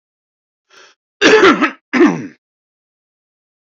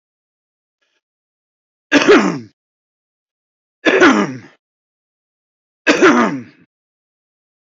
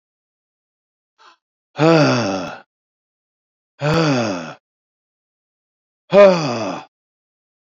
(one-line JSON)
{"cough_length": "3.8 s", "cough_amplitude": 28943, "cough_signal_mean_std_ratio": 0.36, "three_cough_length": "7.8 s", "three_cough_amplitude": 29056, "three_cough_signal_mean_std_ratio": 0.33, "exhalation_length": "7.8 s", "exhalation_amplitude": 28141, "exhalation_signal_mean_std_ratio": 0.36, "survey_phase": "beta (2021-08-13 to 2022-03-07)", "age": "45-64", "gender": "Male", "wearing_mask": "No", "symptom_none": true, "smoker_status": "Current smoker (11 or more cigarettes per day)", "respiratory_condition_asthma": false, "respiratory_condition_other": false, "recruitment_source": "REACT", "submission_delay": "2 days", "covid_test_result": "Negative", "covid_test_method": "RT-qPCR", "influenza_a_test_result": "Negative", "influenza_b_test_result": "Negative"}